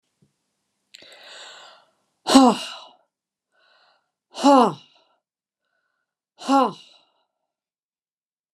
exhalation_length: 8.5 s
exhalation_amplitude: 32767
exhalation_signal_mean_std_ratio: 0.24
survey_phase: beta (2021-08-13 to 2022-03-07)
age: 65+
gender: Female
wearing_mask: 'No'
symptom_none: true
smoker_status: Never smoked
respiratory_condition_asthma: false
respiratory_condition_other: false
recruitment_source: REACT
submission_delay: 2 days
covid_test_result: Negative
covid_test_method: RT-qPCR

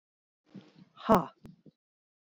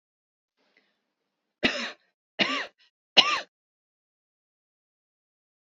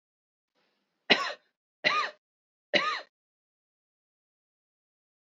exhalation_length: 2.3 s
exhalation_amplitude: 10797
exhalation_signal_mean_std_ratio: 0.21
three_cough_length: 5.6 s
three_cough_amplitude: 27176
three_cough_signal_mean_std_ratio: 0.22
cough_length: 5.4 s
cough_amplitude: 19379
cough_signal_mean_std_ratio: 0.26
survey_phase: alpha (2021-03-01 to 2021-08-12)
age: 65+
gender: Female
wearing_mask: 'No'
symptom_none: true
smoker_status: Ex-smoker
respiratory_condition_asthma: false
respiratory_condition_other: false
recruitment_source: REACT
submission_delay: 1 day
covid_test_result: Negative
covid_test_method: RT-qPCR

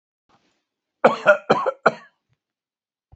cough_length: 3.2 s
cough_amplitude: 30389
cough_signal_mean_std_ratio: 0.28
survey_phase: beta (2021-08-13 to 2022-03-07)
age: 65+
gender: Male
wearing_mask: 'Yes'
symptom_none: true
smoker_status: Ex-smoker
respiratory_condition_asthma: false
respiratory_condition_other: false
recruitment_source: REACT
submission_delay: 1 day
covid_test_result: Negative
covid_test_method: RT-qPCR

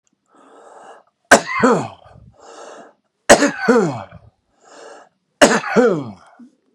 three_cough_length: 6.7 s
three_cough_amplitude: 32768
three_cough_signal_mean_std_ratio: 0.38
survey_phase: beta (2021-08-13 to 2022-03-07)
age: 65+
gender: Male
wearing_mask: 'No'
symptom_new_continuous_cough: true
symptom_runny_or_blocked_nose: true
symptom_sore_throat: true
symptom_fatigue: true
smoker_status: Ex-smoker
respiratory_condition_asthma: false
respiratory_condition_other: false
recruitment_source: Test and Trace
submission_delay: 1 day
covid_test_result: Positive
covid_test_method: RT-qPCR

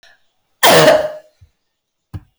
cough_length: 2.4 s
cough_amplitude: 32768
cough_signal_mean_std_ratio: 0.39
survey_phase: beta (2021-08-13 to 2022-03-07)
age: 65+
gender: Female
wearing_mask: 'No'
symptom_none: true
smoker_status: Never smoked
respiratory_condition_asthma: false
respiratory_condition_other: false
recruitment_source: REACT
submission_delay: 15 days
covid_test_result: Negative
covid_test_method: RT-qPCR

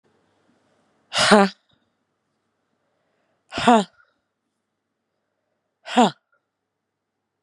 exhalation_length: 7.4 s
exhalation_amplitude: 32767
exhalation_signal_mean_std_ratio: 0.22
survey_phase: beta (2021-08-13 to 2022-03-07)
age: 18-44
gender: Female
wearing_mask: 'No'
symptom_cough_any: true
symptom_runny_or_blocked_nose: true
symptom_sore_throat: true
symptom_fatigue: true
symptom_fever_high_temperature: true
symptom_headache: true
symptom_change_to_sense_of_smell_or_taste: true
symptom_loss_of_taste: true
symptom_onset: 2 days
smoker_status: Never smoked
respiratory_condition_asthma: false
respiratory_condition_other: false
recruitment_source: Test and Trace
submission_delay: 2 days
covid_test_result: Positive
covid_test_method: RT-qPCR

